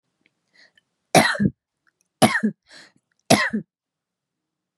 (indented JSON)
{
  "three_cough_length": "4.8 s",
  "three_cough_amplitude": 32759,
  "three_cough_signal_mean_std_ratio": 0.3,
  "survey_phase": "beta (2021-08-13 to 2022-03-07)",
  "age": "45-64",
  "gender": "Female",
  "wearing_mask": "No",
  "symptom_cough_any": true,
  "symptom_runny_or_blocked_nose": true,
  "symptom_sore_throat": true,
  "symptom_fever_high_temperature": true,
  "smoker_status": "Never smoked",
  "recruitment_source": "Test and Trace",
  "submission_delay": "2 days",
  "covid_test_result": "Positive",
  "covid_test_method": "LFT"
}